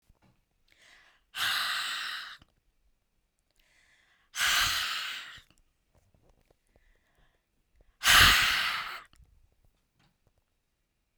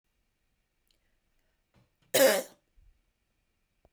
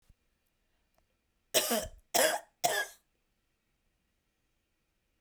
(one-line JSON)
{"exhalation_length": "11.2 s", "exhalation_amplitude": 19799, "exhalation_signal_mean_std_ratio": 0.34, "cough_length": "3.9 s", "cough_amplitude": 10852, "cough_signal_mean_std_ratio": 0.21, "three_cough_length": "5.2 s", "three_cough_amplitude": 8942, "three_cough_signal_mean_std_ratio": 0.3, "survey_phase": "beta (2021-08-13 to 2022-03-07)", "age": "45-64", "gender": "Female", "wearing_mask": "No", "symptom_none": true, "symptom_onset": "3 days", "smoker_status": "Ex-smoker", "respiratory_condition_asthma": false, "respiratory_condition_other": false, "recruitment_source": "Test and Trace", "submission_delay": "1 day", "covid_test_result": "Positive", "covid_test_method": "ePCR"}